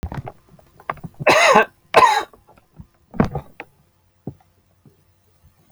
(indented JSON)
{
  "three_cough_length": "5.7 s",
  "three_cough_amplitude": 32767,
  "three_cough_signal_mean_std_ratio": 0.33,
  "survey_phase": "alpha (2021-03-01 to 2021-08-12)",
  "age": "45-64",
  "gender": "Male",
  "wearing_mask": "No",
  "symptom_none": true,
  "smoker_status": "Never smoked",
  "respiratory_condition_asthma": false,
  "respiratory_condition_other": false,
  "recruitment_source": "REACT",
  "submission_delay": "2 days",
  "covid_test_result": "Negative",
  "covid_test_method": "RT-qPCR"
}